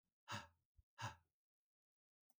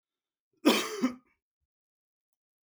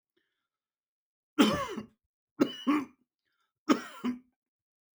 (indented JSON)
{
  "exhalation_length": "2.4 s",
  "exhalation_amplitude": 593,
  "exhalation_signal_mean_std_ratio": 0.29,
  "cough_length": "2.6 s",
  "cough_amplitude": 11395,
  "cough_signal_mean_std_ratio": 0.28,
  "three_cough_length": "4.9 s",
  "three_cough_amplitude": 11667,
  "three_cough_signal_mean_std_ratio": 0.31,
  "survey_phase": "beta (2021-08-13 to 2022-03-07)",
  "age": "45-64",
  "gender": "Male",
  "wearing_mask": "No",
  "symptom_none": true,
  "smoker_status": "Never smoked",
  "respiratory_condition_asthma": false,
  "respiratory_condition_other": false,
  "recruitment_source": "REACT",
  "submission_delay": "2 days",
  "covid_test_result": "Negative",
  "covid_test_method": "RT-qPCR",
  "influenza_a_test_result": "Negative",
  "influenza_b_test_result": "Negative"
}